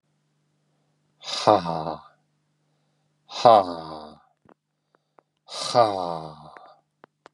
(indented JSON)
{
  "exhalation_length": "7.3 s",
  "exhalation_amplitude": 31193,
  "exhalation_signal_mean_std_ratio": 0.28,
  "survey_phase": "beta (2021-08-13 to 2022-03-07)",
  "age": "18-44",
  "gender": "Male",
  "wearing_mask": "No",
  "symptom_runny_or_blocked_nose": true,
  "symptom_onset": "3 days",
  "smoker_status": "Never smoked",
  "respiratory_condition_asthma": false,
  "respiratory_condition_other": false,
  "recruitment_source": "Test and Trace",
  "submission_delay": "1 day",
  "covid_test_result": "Positive",
  "covid_test_method": "RT-qPCR"
}